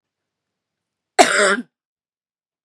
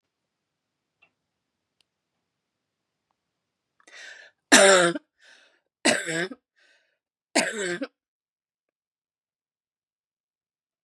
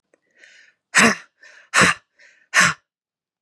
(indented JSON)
{
  "cough_length": "2.6 s",
  "cough_amplitude": 32768,
  "cough_signal_mean_std_ratio": 0.28,
  "three_cough_length": "10.8 s",
  "three_cough_amplitude": 31328,
  "three_cough_signal_mean_std_ratio": 0.23,
  "exhalation_length": "3.4 s",
  "exhalation_amplitude": 31364,
  "exhalation_signal_mean_std_ratio": 0.33,
  "survey_phase": "beta (2021-08-13 to 2022-03-07)",
  "age": "45-64",
  "gender": "Female",
  "wearing_mask": "No",
  "symptom_cough_any": true,
  "symptom_runny_or_blocked_nose": true,
  "symptom_diarrhoea": true,
  "symptom_fatigue": true,
  "symptom_other": true,
  "smoker_status": "Never smoked",
  "respiratory_condition_asthma": false,
  "respiratory_condition_other": false,
  "recruitment_source": "Test and Trace",
  "submission_delay": "1 day",
  "covid_test_result": "Negative",
  "covid_test_method": "LFT"
}